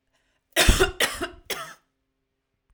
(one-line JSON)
{"cough_length": "2.7 s", "cough_amplitude": 25614, "cough_signal_mean_std_ratio": 0.35, "survey_phase": "alpha (2021-03-01 to 2021-08-12)", "age": "45-64", "gender": "Female", "wearing_mask": "No", "symptom_none": true, "smoker_status": "Never smoked", "respiratory_condition_asthma": false, "respiratory_condition_other": false, "recruitment_source": "REACT", "submission_delay": "3 days", "covid_test_result": "Negative", "covid_test_method": "RT-qPCR"}